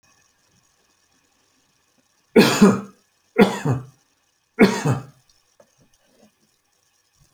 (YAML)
three_cough_length: 7.3 s
three_cough_amplitude: 28288
three_cough_signal_mean_std_ratio: 0.28
survey_phase: alpha (2021-03-01 to 2021-08-12)
age: 45-64
gender: Male
wearing_mask: 'No'
symptom_none: true
smoker_status: Never smoked
respiratory_condition_asthma: false
respiratory_condition_other: false
recruitment_source: REACT
submission_delay: 2 days
covid_test_result: Negative
covid_test_method: RT-qPCR